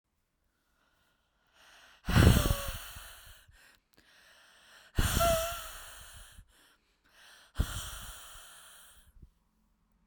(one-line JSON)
{"exhalation_length": "10.1 s", "exhalation_amplitude": 12318, "exhalation_signal_mean_std_ratio": 0.31, "survey_phase": "beta (2021-08-13 to 2022-03-07)", "age": "18-44", "gender": "Female", "wearing_mask": "No", "symptom_cough_any": true, "symptom_runny_or_blocked_nose": true, "symptom_fatigue": true, "symptom_headache": true, "smoker_status": "Never smoked", "respiratory_condition_asthma": false, "respiratory_condition_other": false, "recruitment_source": "Test and Trace", "submission_delay": "2 days", "covid_test_result": "Positive", "covid_test_method": "RT-qPCR"}